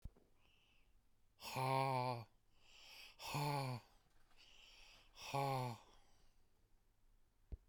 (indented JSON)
{
  "exhalation_length": "7.7 s",
  "exhalation_amplitude": 1703,
  "exhalation_signal_mean_std_ratio": 0.46,
  "survey_phase": "beta (2021-08-13 to 2022-03-07)",
  "age": "45-64",
  "gender": "Male",
  "wearing_mask": "No",
  "symptom_fatigue": true,
  "symptom_onset": "12 days",
  "smoker_status": "Never smoked",
  "respiratory_condition_asthma": false,
  "respiratory_condition_other": false,
  "recruitment_source": "REACT",
  "submission_delay": "1 day",
  "covid_test_result": "Negative",
  "covid_test_method": "RT-qPCR"
}